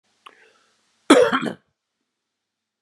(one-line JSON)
{"cough_length": "2.8 s", "cough_amplitude": 31956, "cough_signal_mean_std_ratio": 0.26, "survey_phase": "beta (2021-08-13 to 2022-03-07)", "age": "45-64", "gender": "Male", "wearing_mask": "No", "symptom_runny_or_blocked_nose": true, "symptom_other": true, "smoker_status": "Never smoked", "respiratory_condition_asthma": false, "respiratory_condition_other": false, "recruitment_source": "Test and Trace", "submission_delay": "2 days", "covid_test_result": "Positive", "covid_test_method": "LFT"}